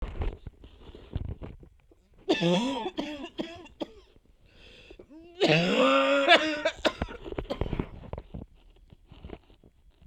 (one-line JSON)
{"cough_length": "10.1 s", "cough_amplitude": 17880, "cough_signal_mean_std_ratio": 0.47, "survey_phase": "beta (2021-08-13 to 2022-03-07)", "age": "18-44", "gender": "Female", "wearing_mask": "No", "symptom_cough_any": true, "symptom_runny_or_blocked_nose": true, "symptom_sore_throat": true, "symptom_abdominal_pain": true, "symptom_fatigue": true, "symptom_headache": true, "symptom_change_to_sense_of_smell_or_taste": true, "symptom_loss_of_taste": true, "symptom_onset": "3 days", "smoker_status": "Current smoker (e-cigarettes or vapes only)", "respiratory_condition_asthma": false, "respiratory_condition_other": false, "recruitment_source": "Test and Trace", "submission_delay": "2 days", "covid_test_result": "Positive", "covid_test_method": "RT-qPCR", "covid_ct_value": 19.5, "covid_ct_gene": "N gene"}